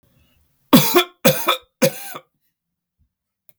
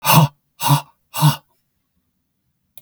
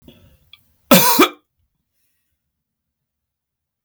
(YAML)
three_cough_length: 3.6 s
three_cough_amplitude: 32768
three_cough_signal_mean_std_ratio: 0.34
exhalation_length: 2.8 s
exhalation_amplitude: 32768
exhalation_signal_mean_std_ratio: 0.37
cough_length: 3.8 s
cough_amplitude: 32768
cough_signal_mean_std_ratio: 0.25
survey_phase: beta (2021-08-13 to 2022-03-07)
age: 65+
gender: Male
wearing_mask: 'No'
symptom_none: true
smoker_status: Never smoked
respiratory_condition_asthma: false
respiratory_condition_other: false
recruitment_source: REACT
submission_delay: 1 day
covid_test_result: Negative
covid_test_method: RT-qPCR
influenza_a_test_result: Negative
influenza_b_test_result: Negative